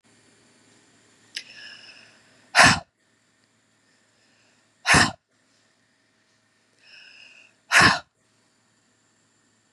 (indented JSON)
{
  "exhalation_length": "9.7 s",
  "exhalation_amplitude": 32767,
  "exhalation_signal_mean_std_ratio": 0.23,
  "survey_phase": "beta (2021-08-13 to 2022-03-07)",
  "age": "45-64",
  "gender": "Female",
  "wearing_mask": "No",
  "symptom_fatigue": true,
  "symptom_headache": true,
  "symptom_other": true,
  "smoker_status": "Ex-smoker",
  "respiratory_condition_asthma": false,
  "respiratory_condition_other": false,
  "recruitment_source": "Test and Trace",
  "submission_delay": "1 day",
  "covid_test_result": "Positive",
  "covid_test_method": "RT-qPCR",
  "covid_ct_value": 16.3,
  "covid_ct_gene": "ORF1ab gene"
}